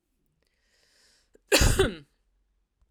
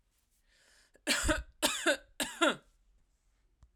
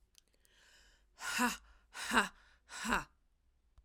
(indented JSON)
{
  "cough_length": "2.9 s",
  "cough_amplitude": 15367,
  "cough_signal_mean_std_ratio": 0.3,
  "three_cough_length": "3.8 s",
  "three_cough_amplitude": 6949,
  "three_cough_signal_mean_std_ratio": 0.39,
  "exhalation_length": "3.8 s",
  "exhalation_amplitude": 7207,
  "exhalation_signal_mean_std_ratio": 0.37,
  "survey_phase": "alpha (2021-03-01 to 2021-08-12)",
  "age": "45-64",
  "gender": "Female",
  "wearing_mask": "No",
  "symptom_none": true,
  "smoker_status": "Never smoked",
  "respiratory_condition_asthma": false,
  "respiratory_condition_other": false,
  "recruitment_source": "REACT",
  "submission_delay": "2 days",
  "covid_test_result": "Negative",
  "covid_test_method": "RT-qPCR"
}